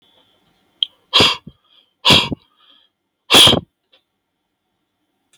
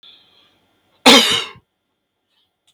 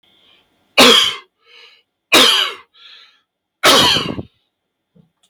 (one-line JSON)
{"exhalation_length": "5.4 s", "exhalation_amplitude": 32768, "exhalation_signal_mean_std_ratio": 0.3, "cough_length": "2.7 s", "cough_amplitude": 32768, "cough_signal_mean_std_ratio": 0.28, "three_cough_length": "5.3 s", "three_cough_amplitude": 32768, "three_cough_signal_mean_std_ratio": 0.41, "survey_phase": "beta (2021-08-13 to 2022-03-07)", "age": "45-64", "gender": "Male", "wearing_mask": "No", "symptom_none": true, "smoker_status": "Never smoked", "respiratory_condition_asthma": false, "respiratory_condition_other": false, "recruitment_source": "REACT", "submission_delay": "0 days", "covid_test_result": "Negative", "covid_test_method": "RT-qPCR", "influenza_a_test_result": "Negative", "influenza_b_test_result": "Negative"}